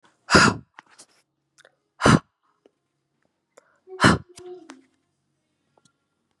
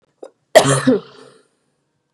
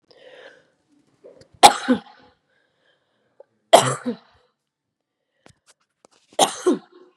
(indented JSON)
{
  "exhalation_length": "6.4 s",
  "exhalation_amplitude": 29428,
  "exhalation_signal_mean_std_ratio": 0.24,
  "cough_length": "2.1 s",
  "cough_amplitude": 32768,
  "cough_signal_mean_std_ratio": 0.33,
  "three_cough_length": "7.2 s",
  "three_cough_amplitude": 32768,
  "three_cough_signal_mean_std_ratio": 0.22,
  "survey_phase": "beta (2021-08-13 to 2022-03-07)",
  "age": "18-44",
  "gender": "Female",
  "wearing_mask": "No",
  "symptom_sore_throat": true,
  "symptom_onset": "3 days",
  "smoker_status": "Never smoked",
  "respiratory_condition_asthma": false,
  "respiratory_condition_other": false,
  "recruitment_source": "Test and Trace",
  "submission_delay": "2 days",
  "covid_test_result": "Positive",
  "covid_test_method": "RT-qPCR",
  "covid_ct_value": 29.6,
  "covid_ct_gene": "ORF1ab gene",
  "covid_ct_mean": 29.9,
  "covid_viral_load": "150 copies/ml",
  "covid_viral_load_category": "Minimal viral load (< 10K copies/ml)"
}